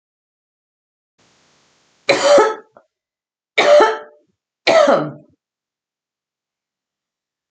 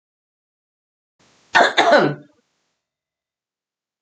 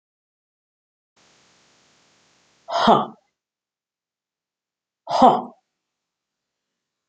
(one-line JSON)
{"three_cough_length": "7.5 s", "three_cough_amplitude": 30759, "three_cough_signal_mean_std_ratio": 0.33, "cough_length": "4.0 s", "cough_amplitude": 32483, "cough_signal_mean_std_ratio": 0.29, "exhalation_length": "7.1 s", "exhalation_amplitude": 30084, "exhalation_signal_mean_std_ratio": 0.22, "survey_phase": "beta (2021-08-13 to 2022-03-07)", "age": "45-64", "gender": "Female", "wearing_mask": "No", "symptom_cough_any": true, "smoker_status": "Never smoked", "respiratory_condition_asthma": false, "respiratory_condition_other": false, "recruitment_source": "Test and Trace", "submission_delay": "-1 day", "covid_test_result": "Positive", "covid_test_method": "LFT"}